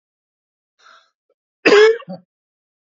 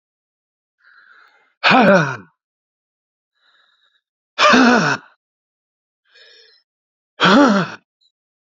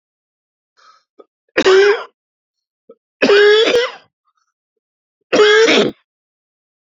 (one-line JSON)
{"cough_length": "2.8 s", "cough_amplitude": 29294, "cough_signal_mean_std_ratio": 0.29, "exhalation_length": "8.5 s", "exhalation_amplitude": 29789, "exhalation_signal_mean_std_ratio": 0.35, "three_cough_length": "6.9 s", "three_cough_amplitude": 30902, "three_cough_signal_mean_std_ratio": 0.43, "survey_phase": "beta (2021-08-13 to 2022-03-07)", "age": "45-64", "gender": "Male", "wearing_mask": "No", "symptom_cough_any": true, "symptom_new_continuous_cough": true, "symptom_shortness_of_breath": true, "symptom_abdominal_pain": true, "symptom_fatigue": true, "symptom_fever_high_temperature": true, "symptom_headache": true, "symptom_change_to_sense_of_smell_or_taste": true, "symptom_loss_of_taste": true, "symptom_onset": "6 days", "smoker_status": "Never smoked", "respiratory_condition_asthma": true, "respiratory_condition_other": false, "recruitment_source": "Test and Trace", "submission_delay": "2 days", "covid_test_result": "Positive", "covid_test_method": "RT-qPCR", "covid_ct_value": 18.0, "covid_ct_gene": "ORF1ab gene"}